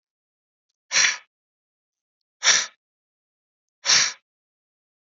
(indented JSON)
{
  "exhalation_length": "5.1 s",
  "exhalation_amplitude": 23343,
  "exhalation_signal_mean_std_ratio": 0.28,
  "survey_phase": "beta (2021-08-13 to 2022-03-07)",
  "age": "45-64",
  "gender": "Male",
  "wearing_mask": "No",
  "symptom_none": true,
  "smoker_status": "Ex-smoker",
  "respiratory_condition_asthma": false,
  "respiratory_condition_other": false,
  "recruitment_source": "REACT",
  "submission_delay": "1 day",
  "covid_test_result": "Negative",
  "covid_test_method": "RT-qPCR",
  "influenza_a_test_result": "Negative",
  "influenza_b_test_result": "Negative"
}